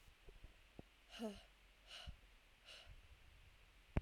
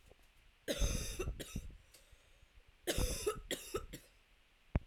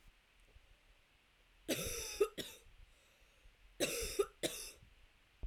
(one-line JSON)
{"exhalation_length": "4.0 s", "exhalation_amplitude": 2363, "exhalation_signal_mean_std_ratio": 0.4, "cough_length": "4.9 s", "cough_amplitude": 3828, "cough_signal_mean_std_ratio": 0.5, "three_cough_length": "5.5 s", "three_cough_amplitude": 2647, "three_cough_signal_mean_std_ratio": 0.41, "survey_phase": "alpha (2021-03-01 to 2021-08-12)", "age": "18-44", "gender": "Female", "wearing_mask": "No", "symptom_cough_any": true, "symptom_shortness_of_breath": true, "symptom_abdominal_pain": true, "symptom_fatigue": true, "symptom_headache": true, "symptom_change_to_sense_of_smell_or_taste": true, "symptom_onset": "5 days", "smoker_status": "Ex-smoker", "respiratory_condition_asthma": false, "respiratory_condition_other": false, "recruitment_source": "Test and Trace", "submission_delay": "2 days", "covid_test_result": "Positive", "covid_test_method": "RT-qPCR", "covid_ct_value": 35.2, "covid_ct_gene": "N gene"}